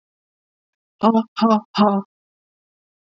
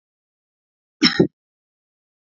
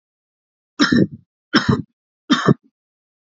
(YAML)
exhalation_length: 3.1 s
exhalation_amplitude: 27815
exhalation_signal_mean_std_ratio: 0.35
cough_length: 2.4 s
cough_amplitude: 32768
cough_signal_mean_std_ratio: 0.21
three_cough_length: 3.3 s
three_cough_amplitude: 30024
three_cough_signal_mean_std_ratio: 0.35
survey_phase: beta (2021-08-13 to 2022-03-07)
age: 45-64
gender: Female
wearing_mask: 'No'
symptom_none: true
smoker_status: Never smoked
respiratory_condition_asthma: false
respiratory_condition_other: false
recruitment_source: REACT
submission_delay: 3 days
covid_test_result: Negative
covid_test_method: RT-qPCR
influenza_a_test_result: Negative
influenza_b_test_result: Negative